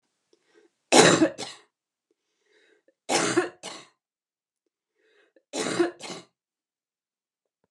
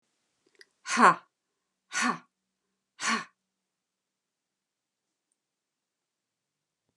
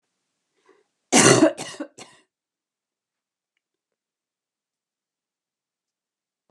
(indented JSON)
{
  "three_cough_length": "7.7 s",
  "three_cough_amplitude": 29968,
  "three_cough_signal_mean_std_ratio": 0.28,
  "exhalation_length": "7.0 s",
  "exhalation_amplitude": 19340,
  "exhalation_signal_mean_std_ratio": 0.21,
  "cough_length": "6.5 s",
  "cough_amplitude": 29491,
  "cough_signal_mean_std_ratio": 0.2,
  "survey_phase": "beta (2021-08-13 to 2022-03-07)",
  "age": "65+",
  "gender": "Female",
  "wearing_mask": "No",
  "symptom_none": true,
  "smoker_status": "Ex-smoker",
  "respiratory_condition_asthma": false,
  "respiratory_condition_other": false,
  "recruitment_source": "REACT",
  "submission_delay": "2 days",
  "covid_test_result": "Negative",
  "covid_test_method": "RT-qPCR",
  "influenza_a_test_result": "Negative",
  "influenza_b_test_result": "Negative"
}